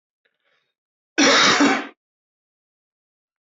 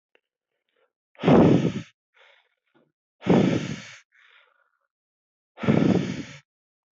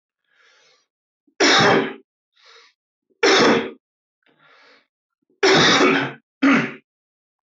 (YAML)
cough_length: 3.4 s
cough_amplitude: 24280
cough_signal_mean_std_ratio: 0.36
exhalation_length: 6.9 s
exhalation_amplitude: 18160
exhalation_signal_mean_std_ratio: 0.36
three_cough_length: 7.4 s
three_cough_amplitude: 21589
three_cough_signal_mean_std_ratio: 0.43
survey_phase: alpha (2021-03-01 to 2021-08-12)
age: 18-44
gender: Male
wearing_mask: 'Yes'
symptom_cough_any: true
symptom_shortness_of_breath: true
symptom_fatigue: true
smoker_status: Current smoker (e-cigarettes or vapes only)
respiratory_condition_asthma: false
respiratory_condition_other: false
recruitment_source: Test and Trace
submission_delay: 2 days
covid_test_result: Positive
covid_test_method: RT-qPCR
covid_ct_value: 18.7
covid_ct_gene: N gene